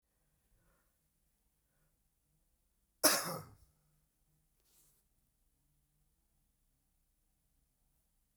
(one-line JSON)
{"cough_length": "8.4 s", "cough_amplitude": 7939, "cough_signal_mean_std_ratio": 0.15, "survey_phase": "beta (2021-08-13 to 2022-03-07)", "age": "65+", "gender": "Male", "wearing_mask": "No", "symptom_cough_any": true, "symptom_runny_or_blocked_nose": true, "smoker_status": "Never smoked", "respiratory_condition_asthma": false, "respiratory_condition_other": false, "recruitment_source": "Test and Trace", "submission_delay": "1 day", "covid_test_result": "Positive", "covid_test_method": "RT-qPCR", "covid_ct_value": 18.8, "covid_ct_gene": "ORF1ab gene"}